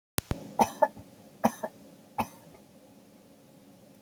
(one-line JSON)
{"three_cough_length": "4.0 s", "three_cough_amplitude": 32768, "three_cough_signal_mean_std_ratio": 0.27, "survey_phase": "beta (2021-08-13 to 2022-03-07)", "age": "65+", "gender": "Female", "wearing_mask": "No", "symptom_none": true, "smoker_status": "Ex-smoker", "respiratory_condition_asthma": false, "respiratory_condition_other": false, "recruitment_source": "REACT", "submission_delay": "3 days", "covid_test_result": "Negative", "covid_test_method": "RT-qPCR", "influenza_a_test_result": "Negative", "influenza_b_test_result": "Negative"}